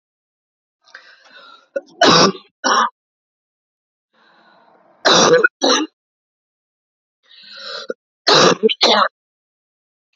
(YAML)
three_cough_length: 10.2 s
three_cough_amplitude: 32767
three_cough_signal_mean_std_ratio: 0.36
survey_phase: beta (2021-08-13 to 2022-03-07)
age: 45-64
gender: Female
wearing_mask: 'No'
symptom_cough_any: true
symptom_runny_or_blocked_nose: true
symptom_shortness_of_breath: true
symptom_sore_throat: true
symptom_fatigue: true
symptom_fever_high_temperature: true
symptom_headache: true
symptom_change_to_sense_of_smell_or_taste: true
symptom_loss_of_taste: true
symptom_onset: 2 days
smoker_status: Never smoked
respiratory_condition_asthma: false
respiratory_condition_other: false
recruitment_source: Test and Trace
submission_delay: 1 day
covid_test_result: Positive
covid_test_method: ePCR